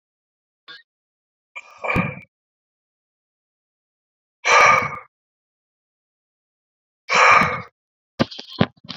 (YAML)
exhalation_length: 9.0 s
exhalation_amplitude: 31547
exhalation_signal_mean_std_ratio: 0.3
survey_phase: beta (2021-08-13 to 2022-03-07)
age: 45-64
gender: Male
wearing_mask: 'No'
symptom_none: true
smoker_status: Never smoked
respiratory_condition_asthma: false
respiratory_condition_other: false
recruitment_source: REACT
submission_delay: 1 day
covid_test_result: Negative
covid_test_method: RT-qPCR